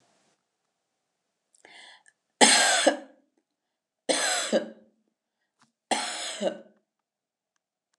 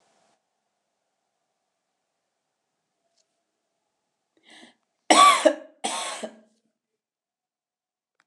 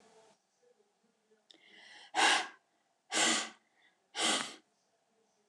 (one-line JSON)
{"three_cough_length": "8.0 s", "three_cough_amplitude": 28066, "three_cough_signal_mean_std_ratio": 0.32, "cough_length": "8.3 s", "cough_amplitude": 29173, "cough_signal_mean_std_ratio": 0.2, "exhalation_length": "5.5 s", "exhalation_amplitude": 6248, "exhalation_signal_mean_std_ratio": 0.35, "survey_phase": "alpha (2021-03-01 to 2021-08-12)", "age": "45-64", "gender": "Female", "wearing_mask": "No", "symptom_none": true, "smoker_status": "Never smoked", "respiratory_condition_asthma": false, "respiratory_condition_other": false, "recruitment_source": "REACT", "submission_delay": "3 days", "covid_test_result": "Negative", "covid_test_method": "RT-qPCR"}